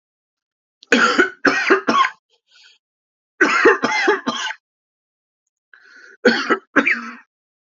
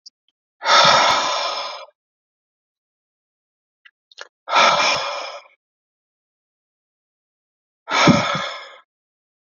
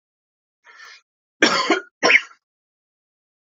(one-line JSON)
{"three_cough_length": "7.8 s", "three_cough_amplitude": 32768, "three_cough_signal_mean_std_ratio": 0.44, "exhalation_length": "9.6 s", "exhalation_amplitude": 29160, "exhalation_signal_mean_std_ratio": 0.38, "cough_length": "3.4 s", "cough_amplitude": 32767, "cough_signal_mean_std_ratio": 0.31, "survey_phase": "alpha (2021-03-01 to 2021-08-12)", "age": "18-44", "gender": "Male", "wearing_mask": "No", "symptom_cough_any": true, "symptom_new_continuous_cough": true, "symptom_shortness_of_breath": true, "symptom_fatigue": true, "symptom_onset": "6 days", "smoker_status": "Never smoked", "respiratory_condition_asthma": false, "respiratory_condition_other": false, "recruitment_source": "Test and Trace", "submission_delay": "0 days", "covid_test_result": "Positive", "covid_test_method": "RT-qPCR", "covid_ct_value": 17.3, "covid_ct_gene": "N gene", "covid_ct_mean": 17.5, "covid_viral_load": "1800000 copies/ml", "covid_viral_load_category": "High viral load (>1M copies/ml)"}